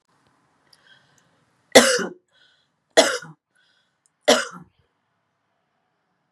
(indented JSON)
{
  "three_cough_length": "6.3 s",
  "three_cough_amplitude": 32768,
  "three_cough_signal_mean_std_ratio": 0.23,
  "survey_phase": "beta (2021-08-13 to 2022-03-07)",
  "age": "45-64",
  "gender": "Female",
  "wearing_mask": "No",
  "symptom_none": true,
  "smoker_status": "Never smoked",
  "respiratory_condition_asthma": false,
  "respiratory_condition_other": false,
  "recruitment_source": "REACT",
  "submission_delay": "2 days",
  "covid_test_result": "Negative",
  "covid_test_method": "RT-qPCR",
  "influenza_a_test_result": "Negative",
  "influenza_b_test_result": "Negative"
}